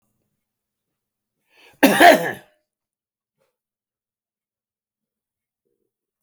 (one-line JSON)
{"cough_length": "6.2 s", "cough_amplitude": 30998, "cough_signal_mean_std_ratio": 0.19, "survey_phase": "beta (2021-08-13 to 2022-03-07)", "age": "65+", "gender": "Male", "wearing_mask": "No", "symptom_cough_any": true, "symptom_runny_or_blocked_nose": true, "symptom_sore_throat": true, "smoker_status": "Ex-smoker", "respiratory_condition_asthma": false, "respiratory_condition_other": false, "recruitment_source": "Test and Trace", "submission_delay": "2 days", "covid_test_result": "Positive", "covid_test_method": "ePCR"}